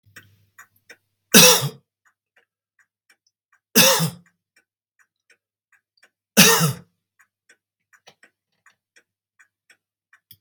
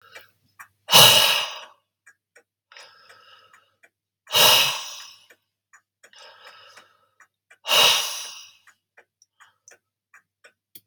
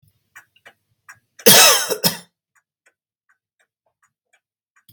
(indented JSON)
{
  "three_cough_length": "10.4 s",
  "three_cough_amplitude": 32768,
  "three_cough_signal_mean_std_ratio": 0.24,
  "exhalation_length": "10.9 s",
  "exhalation_amplitude": 32767,
  "exhalation_signal_mean_std_ratio": 0.3,
  "cough_length": "4.9 s",
  "cough_amplitude": 32768,
  "cough_signal_mean_std_ratio": 0.26,
  "survey_phase": "beta (2021-08-13 to 2022-03-07)",
  "age": "65+",
  "gender": "Male",
  "wearing_mask": "No",
  "symptom_none": true,
  "smoker_status": "Never smoked",
  "respiratory_condition_asthma": false,
  "respiratory_condition_other": false,
  "recruitment_source": "REACT",
  "submission_delay": "2 days",
  "covid_test_result": "Negative",
  "covid_test_method": "RT-qPCR",
  "influenza_a_test_result": "Negative",
  "influenza_b_test_result": "Negative"
}